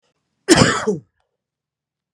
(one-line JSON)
{"cough_length": "2.1 s", "cough_amplitude": 32768, "cough_signal_mean_std_ratio": 0.33, "survey_phase": "beta (2021-08-13 to 2022-03-07)", "age": "45-64", "gender": "Male", "wearing_mask": "No", "symptom_cough_any": true, "symptom_runny_or_blocked_nose": true, "symptom_fatigue": true, "symptom_headache": true, "symptom_change_to_sense_of_smell_or_taste": true, "symptom_onset": "2 days", "smoker_status": "Never smoked", "respiratory_condition_asthma": false, "respiratory_condition_other": false, "recruitment_source": "Test and Trace", "submission_delay": "1 day", "covid_test_result": "Positive", "covid_test_method": "RT-qPCR", "covid_ct_value": 25.3, "covid_ct_gene": "N gene"}